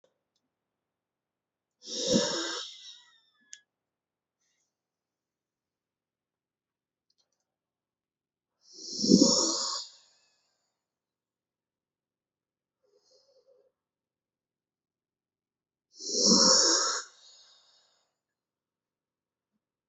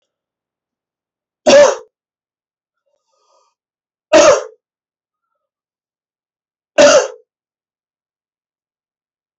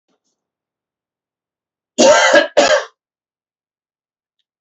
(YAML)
exhalation_length: 19.9 s
exhalation_amplitude: 19165
exhalation_signal_mean_std_ratio: 0.26
three_cough_length: 9.4 s
three_cough_amplitude: 31504
three_cough_signal_mean_std_ratio: 0.26
cough_length: 4.6 s
cough_amplitude: 31631
cough_signal_mean_std_ratio: 0.33
survey_phase: beta (2021-08-13 to 2022-03-07)
age: 18-44
gender: Male
wearing_mask: 'No'
symptom_runny_or_blocked_nose: true
symptom_fatigue: true
symptom_fever_high_temperature: true
symptom_headache: true
symptom_onset: 2 days
smoker_status: Never smoked
respiratory_condition_asthma: false
respiratory_condition_other: false
recruitment_source: Test and Trace
submission_delay: 1 day
covid_test_result: Positive
covid_test_method: LAMP